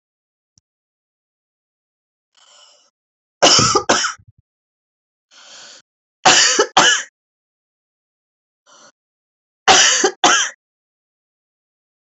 {
  "three_cough_length": "12.0 s",
  "three_cough_amplitude": 32315,
  "three_cough_signal_mean_std_ratio": 0.32,
  "survey_phase": "beta (2021-08-13 to 2022-03-07)",
  "age": "45-64",
  "gender": "Female",
  "wearing_mask": "No",
  "symptom_cough_any": true,
  "symptom_runny_or_blocked_nose": true,
  "symptom_sore_throat": true,
  "symptom_headache": true,
  "smoker_status": "Never smoked",
  "respiratory_condition_asthma": false,
  "respiratory_condition_other": false,
  "recruitment_source": "Test and Trace",
  "submission_delay": "1 day",
  "covid_test_result": "Positive",
  "covid_test_method": "RT-qPCR",
  "covid_ct_value": 32.4,
  "covid_ct_gene": "N gene"
}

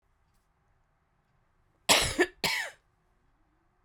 {
  "cough_length": "3.8 s",
  "cough_amplitude": 14158,
  "cough_signal_mean_std_ratio": 0.28,
  "survey_phase": "beta (2021-08-13 to 2022-03-07)",
  "age": "45-64",
  "gender": "Female",
  "wearing_mask": "No",
  "symptom_cough_any": true,
  "symptom_runny_or_blocked_nose": true,
  "symptom_sore_throat": true,
  "symptom_fatigue": true,
  "symptom_headache": true,
  "symptom_change_to_sense_of_smell_or_taste": true,
  "symptom_onset": "4 days",
  "smoker_status": "Never smoked",
  "respiratory_condition_asthma": false,
  "respiratory_condition_other": false,
  "recruitment_source": "Test and Trace",
  "submission_delay": "2 days",
  "covid_test_result": "Positive",
  "covid_test_method": "RT-qPCR",
  "covid_ct_value": 22.2,
  "covid_ct_gene": "ORF1ab gene"
}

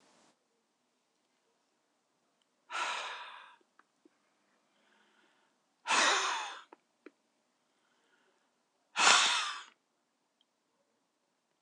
{
  "exhalation_length": "11.6 s",
  "exhalation_amplitude": 14620,
  "exhalation_signal_mean_std_ratio": 0.28,
  "survey_phase": "beta (2021-08-13 to 2022-03-07)",
  "age": "45-64",
  "gender": "Female",
  "wearing_mask": "No",
  "symptom_none": true,
  "smoker_status": "Current smoker (11 or more cigarettes per day)",
  "respiratory_condition_asthma": false,
  "respiratory_condition_other": false,
  "recruitment_source": "REACT",
  "submission_delay": "2 days",
  "covid_test_result": "Negative",
  "covid_test_method": "RT-qPCR"
}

